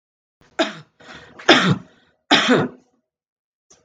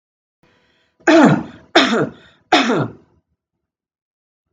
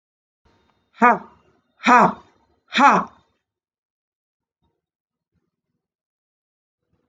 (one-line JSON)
{"cough_length": "3.8 s", "cough_amplitude": 32768, "cough_signal_mean_std_ratio": 0.35, "three_cough_length": "4.5 s", "three_cough_amplitude": 32768, "three_cough_signal_mean_std_ratio": 0.37, "exhalation_length": "7.1 s", "exhalation_amplitude": 32128, "exhalation_signal_mean_std_ratio": 0.24, "survey_phase": "beta (2021-08-13 to 2022-03-07)", "age": "45-64", "gender": "Female", "wearing_mask": "No", "symptom_none": true, "smoker_status": "Ex-smoker", "respiratory_condition_asthma": false, "respiratory_condition_other": false, "recruitment_source": "REACT", "submission_delay": "4 days", "covid_test_result": "Negative", "covid_test_method": "RT-qPCR", "influenza_a_test_result": "Unknown/Void", "influenza_b_test_result": "Unknown/Void"}